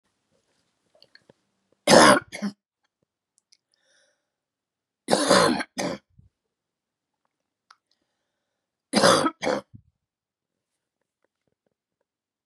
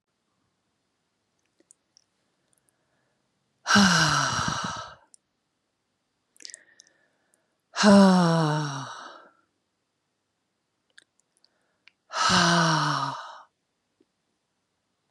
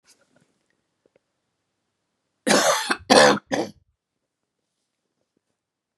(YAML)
three_cough_length: 12.5 s
three_cough_amplitude: 29554
three_cough_signal_mean_std_ratio: 0.25
exhalation_length: 15.1 s
exhalation_amplitude: 19488
exhalation_signal_mean_std_ratio: 0.34
cough_length: 6.0 s
cough_amplitude: 32522
cough_signal_mean_std_ratio: 0.28
survey_phase: beta (2021-08-13 to 2022-03-07)
age: 45-64
gender: Female
wearing_mask: 'No'
symptom_cough_any: true
symptom_runny_or_blocked_nose: true
symptom_fatigue: true
symptom_change_to_sense_of_smell_or_taste: true
symptom_onset: 6 days
smoker_status: Ex-smoker
respiratory_condition_asthma: false
respiratory_condition_other: false
recruitment_source: Test and Trace
submission_delay: 3 days
covid_test_result: Positive
covid_test_method: RT-qPCR
covid_ct_value: 16.3
covid_ct_gene: N gene
covid_ct_mean: 17.7
covid_viral_load: 1500000 copies/ml
covid_viral_load_category: High viral load (>1M copies/ml)